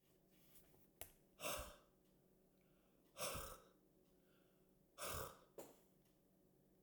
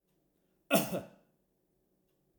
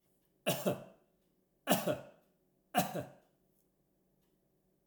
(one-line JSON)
{"exhalation_length": "6.8 s", "exhalation_amplitude": 746, "exhalation_signal_mean_std_ratio": 0.42, "cough_length": "2.4 s", "cough_amplitude": 7478, "cough_signal_mean_std_ratio": 0.25, "three_cough_length": "4.9 s", "three_cough_amplitude": 5046, "three_cough_signal_mean_std_ratio": 0.32, "survey_phase": "alpha (2021-03-01 to 2021-08-12)", "age": "65+", "gender": "Male", "wearing_mask": "No", "symptom_none": true, "smoker_status": "Never smoked", "respiratory_condition_asthma": false, "respiratory_condition_other": false, "recruitment_source": "REACT", "submission_delay": "1 day", "covid_test_result": "Negative", "covid_test_method": "RT-qPCR"}